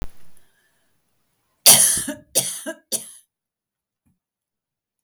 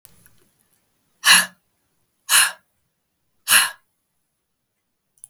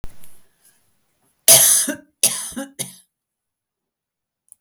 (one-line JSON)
{"three_cough_length": "5.0 s", "three_cough_amplitude": 32768, "three_cough_signal_mean_std_ratio": 0.28, "exhalation_length": "5.3 s", "exhalation_amplitude": 32768, "exhalation_signal_mean_std_ratio": 0.26, "cough_length": "4.6 s", "cough_amplitude": 32768, "cough_signal_mean_std_ratio": 0.31, "survey_phase": "beta (2021-08-13 to 2022-03-07)", "age": "65+", "gender": "Female", "wearing_mask": "No", "symptom_none": true, "smoker_status": "Ex-smoker", "respiratory_condition_asthma": false, "respiratory_condition_other": false, "recruitment_source": "REACT", "submission_delay": "1 day", "covid_test_result": "Negative", "covid_test_method": "RT-qPCR", "influenza_a_test_result": "Negative", "influenza_b_test_result": "Negative"}